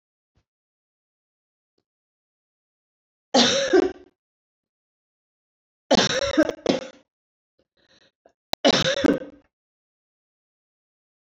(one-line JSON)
{"three_cough_length": "11.3 s", "three_cough_amplitude": 22851, "three_cough_signal_mean_std_ratio": 0.29, "survey_phase": "beta (2021-08-13 to 2022-03-07)", "age": "65+", "gender": "Female", "wearing_mask": "No", "symptom_none": true, "smoker_status": "Ex-smoker", "respiratory_condition_asthma": false, "respiratory_condition_other": false, "recruitment_source": "REACT", "submission_delay": "0 days", "covid_test_result": "Negative", "covid_test_method": "RT-qPCR"}